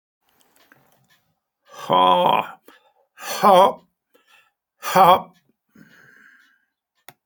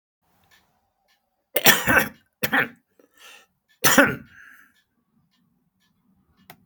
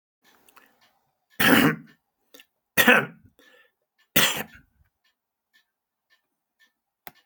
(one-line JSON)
{"exhalation_length": "7.3 s", "exhalation_amplitude": 28819, "exhalation_signal_mean_std_ratio": 0.32, "cough_length": "6.7 s", "cough_amplitude": 32768, "cough_signal_mean_std_ratio": 0.28, "three_cough_length": "7.3 s", "three_cough_amplitude": 27728, "three_cough_signal_mean_std_ratio": 0.27, "survey_phase": "alpha (2021-03-01 to 2021-08-12)", "age": "65+", "gender": "Male", "wearing_mask": "No", "symptom_diarrhoea": true, "symptom_fever_high_temperature": true, "symptom_headache": true, "symptom_onset": "7 days", "smoker_status": "Ex-smoker", "respiratory_condition_asthma": false, "respiratory_condition_other": false, "recruitment_source": "Test and Trace", "submission_delay": "2 days", "covid_test_result": "Positive", "covid_test_method": "RT-qPCR", "covid_ct_value": 19.9, "covid_ct_gene": "ORF1ab gene", "covid_ct_mean": 20.5, "covid_viral_load": "180000 copies/ml", "covid_viral_load_category": "Low viral load (10K-1M copies/ml)"}